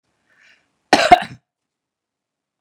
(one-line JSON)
{"cough_length": "2.6 s", "cough_amplitude": 32768, "cough_signal_mean_std_ratio": 0.21, "survey_phase": "beta (2021-08-13 to 2022-03-07)", "age": "45-64", "gender": "Female", "wearing_mask": "No", "symptom_none": true, "smoker_status": "Ex-smoker", "respiratory_condition_asthma": false, "respiratory_condition_other": false, "recruitment_source": "REACT", "submission_delay": "3 days", "covid_test_result": "Negative", "covid_test_method": "RT-qPCR", "influenza_a_test_result": "Negative", "influenza_b_test_result": "Negative"}